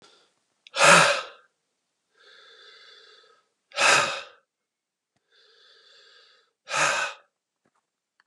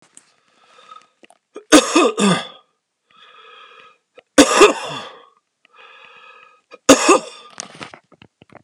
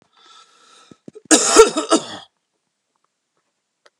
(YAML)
exhalation_length: 8.3 s
exhalation_amplitude: 26917
exhalation_signal_mean_std_ratio: 0.29
three_cough_length: 8.6 s
three_cough_amplitude: 32768
three_cough_signal_mean_std_ratio: 0.3
cough_length: 4.0 s
cough_amplitude: 32768
cough_signal_mean_std_ratio: 0.28
survey_phase: alpha (2021-03-01 to 2021-08-12)
age: 45-64
gender: Male
wearing_mask: 'No'
symptom_cough_any: true
symptom_shortness_of_breath: true
symptom_fatigue: true
symptom_headache: true
symptom_loss_of_taste: true
symptom_onset: 3 days
smoker_status: Never smoked
respiratory_condition_asthma: true
respiratory_condition_other: false
recruitment_source: Test and Trace
submission_delay: 2 days
covid_test_result: Positive
covid_test_method: RT-qPCR
covid_ct_value: 11.4
covid_ct_gene: ORF1ab gene
covid_ct_mean: 11.7
covid_viral_load: 140000000 copies/ml
covid_viral_load_category: High viral load (>1M copies/ml)